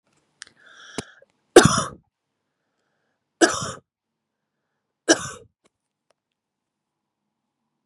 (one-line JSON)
{"three_cough_length": "7.9 s", "three_cough_amplitude": 32768, "three_cough_signal_mean_std_ratio": 0.18, "survey_phase": "beta (2021-08-13 to 2022-03-07)", "age": "18-44", "gender": "Female", "wearing_mask": "No", "symptom_none": true, "smoker_status": "Never smoked", "respiratory_condition_asthma": false, "respiratory_condition_other": false, "recruitment_source": "REACT", "submission_delay": "0 days", "covid_test_result": "Negative", "covid_test_method": "RT-qPCR", "influenza_a_test_result": "Negative", "influenza_b_test_result": "Negative"}